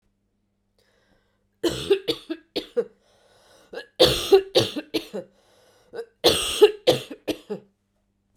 {"three_cough_length": "8.4 s", "three_cough_amplitude": 27090, "three_cough_signal_mean_std_ratio": 0.34, "survey_phase": "beta (2021-08-13 to 2022-03-07)", "age": "45-64", "gender": "Female", "wearing_mask": "No", "symptom_cough_any": true, "symptom_runny_or_blocked_nose": true, "symptom_headache": true, "symptom_change_to_sense_of_smell_or_taste": true, "symptom_loss_of_taste": true, "symptom_other": true, "symptom_onset": "4 days", "smoker_status": "Never smoked", "respiratory_condition_asthma": false, "respiratory_condition_other": false, "recruitment_source": "Test and Trace", "submission_delay": "2 days", "covid_test_result": "Positive", "covid_test_method": "RT-qPCR", "covid_ct_value": 13.2, "covid_ct_gene": "ORF1ab gene", "covid_ct_mean": 13.7, "covid_viral_load": "32000000 copies/ml", "covid_viral_load_category": "High viral load (>1M copies/ml)"}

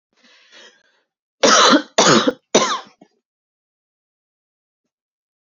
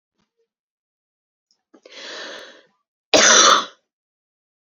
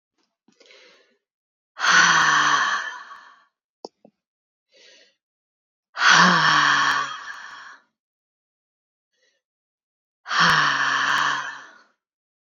{"three_cough_length": "5.5 s", "three_cough_amplitude": 32500, "three_cough_signal_mean_std_ratio": 0.33, "cough_length": "4.6 s", "cough_amplitude": 32768, "cough_signal_mean_std_ratio": 0.29, "exhalation_length": "12.5 s", "exhalation_amplitude": 26266, "exhalation_signal_mean_std_ratio": 0.44, "survey_phase": "beta (2021-08-13 to 2022-03-07)", "age": "18-44", "gender": "Female", "wearing_mask": "No", "symptom_none": true, "smoker_status": "Never smoked", "respiratory_condition_asthma": false, "respiratory_condition_other": false, "recruitment_source": "REACT", "submission_delay": "1 day", "covid_test_result": "Negative", "covid_test_method": "RT-qPCR"}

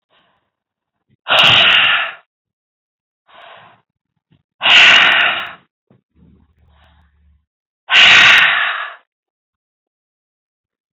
{"exhalation_length": "10.9 s", "exhalation_amplitude": 32768, "exhalation_signal_mean_std_ratio": 0.4, "survey_phase": "alpha (2021-03-01 to 2021-08-12)", "age": "45-64", "gender": "Male", "wearing_mask": "No", "symptom_none": true, "smoker_status": "Never smoked", "respiratory_condition_asthma": false, "respiratory_condition_other": false, "recruitment_source": "REACT", "submission_delay": "2 days", "covid_test_result": "Negative", "covid_test_method": "RT-qPCR"}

